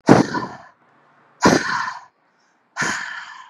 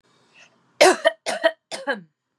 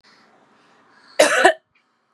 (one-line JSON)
{"exhalation_length": "3.5 s", "exhalation_amplitude": 32768, "exhalation_signal_mean_std_ratio": 0.4, "three_cough_length": "2.4 s", "three_cough_amplitude": 29250, "three_cough_signal_mean_std_ratio": 0.34, "cough_length": "2.1 s", "cough_amplitude": 32768, "cough_signal_mean_std_ratio": 0.31, "survey_phase": "beta (2021-08-13 to 2022-03-07)", "age": "18-44", "gender": "Female", "wearing_mask": "No", "symptom_none": true, "smoker_status": "Never smoked", "respiratory_condition_asthma": false, "respiratory_condition_other": false, "recruitment_source": "REACT", "submission_delay": "3 days", "covid_test_result": "Negative", "covid_test_method": "RT-qPCR"}